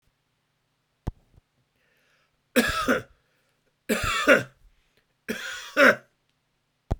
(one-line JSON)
{"three_cough_length": "7.0 s", "three_cough_amplitude": 20189, "three_cough_signal_mean_std_ratio": 0.32, "survey_phase": "beta (2021-08-13 to 2022-03-07)", "age": "65+", "gender": "Male", "wearing_mask": "No", "symptom_sore_throat": true, "smoker_status": "Never smoked", "respiratory_condition_asthma": false, "respiratory_condition_other": false, "recruitment_source": "REACT", "submission_delay": "3 days", "covid_test_result": "Negative", "covid_test_method": "RT-qPCR", "influenza_a_test_result": "Negative", "influenza_b_test_result": "Negative"}